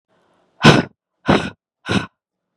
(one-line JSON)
{"exhalation_length": "2.6 s", "exhalation_amplitude": 32768, "exhalation_signal_mean_std_ratio": 0.33, "survey_phase": "beta (2021-08-13 to 2022-03-07)", "age": "18-44", "gender": "Female", "wearing_mask": "No", "symptom_none": true, "smoker_status": "Ex-smoker", "respiratory_condition_asthma": false, "respiratory_condition_other": false, "recruitment_source": "REACT", "submission_delay": "0 days", "covid_test_result": "Negative", "covid_test_method": "RT-qPCR", "influenza_a_test_result": "Unknown/Void", "influenza_b_test_result": "Unknown/Void"}